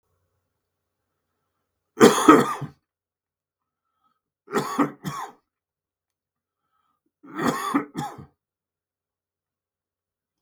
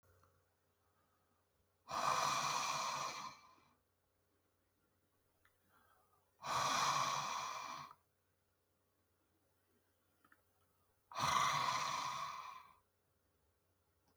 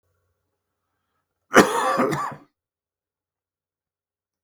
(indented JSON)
{
  "three_cough_length": "10.4 s",
  "three_cough_amplitude": 32766,
  "three_cough_signal_mean_std_ratio": 0.24,
  "exhalation_length": "14.2 s",
  "exhalation_amplitude": 2679,
  "exhalation_signal_mean_std_ratio": 0.45,
  "cough_length": "4.4 s",
  "cough_amplitude": 32768,
  "cough_signal_mean_std_ratio": 0.27,
  "survey_phase": "beta (2021-08-13 to 2022-03-07)",
  "age": "65+",
  "gender": "Male",
  "wearing_mask": "No",
  "symptom_cough_any": true,
  "symptom_runny_or_blocked_nose": true,
  "symptom_onset": "12 days",
  "smoker_status": "Never smoked",
  "respiratory_condition_asthma": false,
  "respiratory_condition_other": false,
  "recruitment_source": "REACT",
  "submission_delay": "3 days",
  "covid_test_result": "Negative",
  "covid_test_method": "RT-qPCR",
  "influenza_a_test_result": "Negative",
  "influenza_b_test_result": "Negative"
}